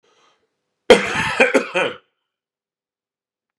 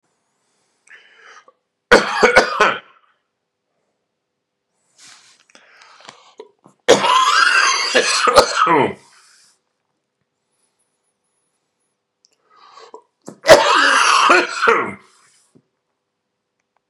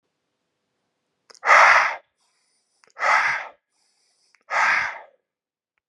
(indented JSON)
{
  "cough_length": "3.6 s",
  "cough_amplitude": 32768,
  "cough_signal_mean_std_ratio": 0.32,
  "three_cough_length": "16.9 s",
  "three_cough_amplitude": 32768,
  "three_cough_signal_mean_std_ratio": 0.38,
  "exhalation_length": "5.9 s",
  "exhalation_amplitude": 29101,
  "exhalation_signal_mean_std_ratio": 0.36,
  "survey_phase": "beta (2021-08-13 to 2022-03-07)",
  "age": "18-44",
  "gender": "Male",
  "wearing_mask": "No",
  "symptom_cough_any": true,
  "symptom_runny_or_blocked_nose": true,
  "symptom_onset": "11 days",
  "smoker_status": "Never smoked",
  "respiratory_condition_asthma": false,
  "respiratory_condition_other": false,
  "recruitment_source": "REACT",
  "submission_delay": "1 day",
  "covid_test_result": "Negative",
  "covid_test_method": "RT-qPCR"
}